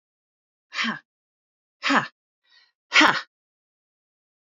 {"exhalation_length": "4.4 s", "exhalation_amplitude": 27937, "exhalation_signal_mean_std_ratio": 0.27, "survey_phase": "beta (2021-08-13 to 2022-03-07)", "age": "45-64", "gender": "Female", "wearing_mask": "No", "symptom_none": true, "smoker_status": "Ex-smoker", "respiratory_condition_asthma": true, "respiratory_condition_other": true, "recruitment_source": "Test and Trace", "submission_delay": "1 day", "covid_test_result": "Negative", "covid_test_method": "RT-qPCR"}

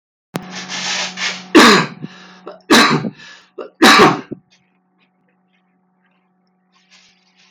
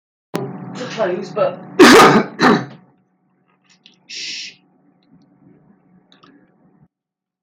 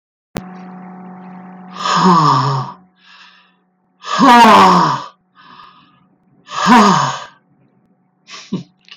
{"three_cough_length": "7.5 s", "three_cough_amplitude": 32768, "three_cough_signal_mean_std_ratio": 0.38, "cough_length": "7.4 s", "cough_amplitude": 32768, "cough_signal_mean_std_ratio": 0.34, "exhalation_length": "9.0 s", "exhalation_amplitude": 32768, "exhalation_signal_mean_std_ratio": 0.46, "survey_phase": "beta (2021-08-13 to 2022-03-07)", "age": "45-64", "gender": "Male", "wearing_mask": "No", "symptom_none": true, "smoker_status": "Never smoked", "respiratory_condition_asthma": false, "respiratory_condition_other": false, "recruitment_source": "REACT", "submission_delay": "2 days", "covid_test_result": "Negative", "covid_test_method": "RT-qPCR", "influenza_a_test_result": "Unknown/Void", "influenza_b_test_result": "Unknown/Void"}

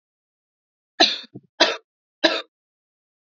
{"three_cough_length": "3.3 s", "three_cough_amplitude": 30887, "three_cough_signal_mean_std_ratio": 0.26, "survey_phase": "beta (2021-08-13 to 2022-03-07)", "age": "18-44", "gender": "Female", "wearing_mask": "No", "symptom_cough_any": true, "symptom_new_continuous_cough": true, "symptom_runny_or_blocked_nose": true, "symptom_headache": true, "symptom_change_to_sense_of_smell_or_taste": true, "symptom_loss_of_taste": true, "symptom_onset": "3 days", "smoker_status": "Ex-smoker", "respiratory_condition_asthma": false, "respiratory_condition_other": false, "recruitment_source": "Test and Trace", "submission_delay": "2 days", "covid_test_result": "Positive", "covid_test_method": "ePCR"}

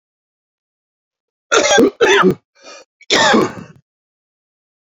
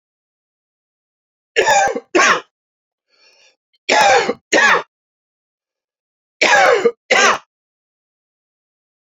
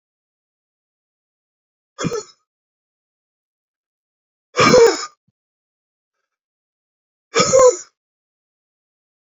{"cough_length": "4.9 s", "cough_amplitude": 32767, "cough_signal_mean_std_ratio": 0.41, "three_cough_length": "9.1 s", "three_cough_amplitude": 32768, "three_cough_signal_mean_std_ratio": 0.4, "exhalation_length": "9.2 s", "exhalation_amplitude": 28330, "exhalation_signal_mean_std_ratio": 0.25, "survey_phase": "beta (2021-08-13 to 2022-03-07)", "age": "65+", "gender": "Male", "wearing_mask": "No", "symptom_none": true, "smoker_status": "Never smoked", "respiratory_condition_asthma": false, "respiratory_condition_other": false, "recruitment_source": "REACT", "submission_delay": "0 days", "covid_test_result": "Negative", "covid_test_method": "RT-qPCR"}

